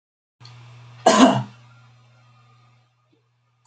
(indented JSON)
{
  "cough_length": "3.7 s",
  "cough_amplitude": 28970,
  "cough_signal_mean_std_ratio": 0.27,
  "survey_phase": "beta (2021-08-13 to 2022-03-07)",
  "age": "65+",
  "gender": "Female",
  "wearing_mask": "No",
  "symptom_none": true,
  "smoker_status": "Never smoked",
  "respiratory_condition_asthma": false,
  "respiratory_condition_other": false,
  "recruitment_source": "REACT",
  "submission_delay": "2 days",
  "covid_test_result": "Negative",
  "covid_test_method": "RT-qPCR"
}